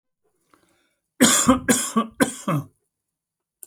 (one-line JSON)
{"three_cough_length": "3.7 s", "three_cough_amplitude": 29597, "three_cough_signal_mean_std_ratio": 0.39, "survey_phase": "alpha (2021-03-01 to 2021-08-12)", "age": "45-64", "gender": "Male", "wearing_mask": "No", "symptom_headache": true, "smoker_status": "Never smoked", "respiratory_condition_asthma": false, "respiratory_condition_other": false, "recruitment_source": "REACT", "submission_delay": "2 days", "covid_test_result": "Negative", "covid_test_method": "RT-qPCR"}